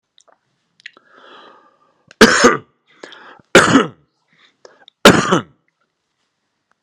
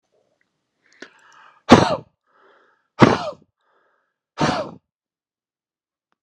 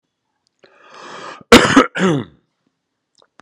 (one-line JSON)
{"three_cough_length": "6.8 s", "three_cough_amplitude": 32768, "three_cough_signal_mean_std_ratio": 0.29, "exhalation_length": "6.2 s", "exhalation_amplitude": 32768, "exhalation_signal_mean_std_ratio": 0.23, "cough_length": "3.4 s", "cough_amplitude": 32768, "cough_signal_mean_std_ratio": 0.31, "survey_phase": "alpha (2021-03-01 to 2021-08-12)", "age": "18-44", "gender": "Male", "wearing_mask": "No", "symptom_none": true, "smoker_status": "Never smoked", "respiratory_condition_asthma": false, "respiratory_condition_other": false, "recruitment_source": "REACT", "submission_delay": "2 days", "covid_test_result": "Negative", "covid_test_method": "RT-qPCR"}